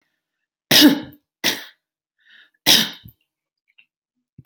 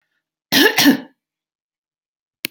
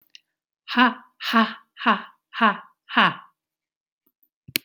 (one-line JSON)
{"three_cough_length": "4.5 s", "three_cough_amplitude": 32768, "three_cough_signal_mean_std_ratio": 0.29, "cough_length": "2.5 s", "cough_amplitude": 32767, "cough_signal_mean_std_ratio": 0.33, "exhalation_length": "4.6 s", "exhalation_amplitude": 32767, "exhalation_signal_mean_std_ratio": 0.34, "survey_phase": "beta (2021-08-13 to 2022-03-07)", "age": "65+", "gender": "Female", "wearing_mask": "No", "symptom_shortness_of_breath": true, "symptom_fatigue": true, "symptom_onset": "12 days", "smoker_status": "Never smoked", "respiratory_condition_asthma": false, "respiratory_condition_other": false, "recruitment_source": "REACT", "submission_delay": "1 day", "covid_test_result": "Negative", "covid_test_method": "RT-qPCR", "influenza_a_test_result": "Negative", "influenza_b_test_result": "Negative"}